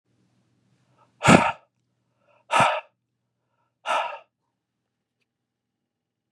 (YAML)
exhalation_length: 6.3 s
exhalation_amplitude: 32734
exhalation_signal_mean_std_ratio: 0.24
survey_phase: beta (2021-08-13 to 2022-03-07)
age: 45-64
gender: Male
wearing_mask: 'No'
symptom_other: true
symptom_onset: 3 days
smoker_status: Ex-smoker
respiratory_condition_asthma: false
respiratory_condition_other: false
recruitment_source: REACT
submission_delay: 1 day
covid_test_result: Negative
covid_test_method: RT-qPCR
influenza_a_test_result: Negative
influenza_b_test_result: Negative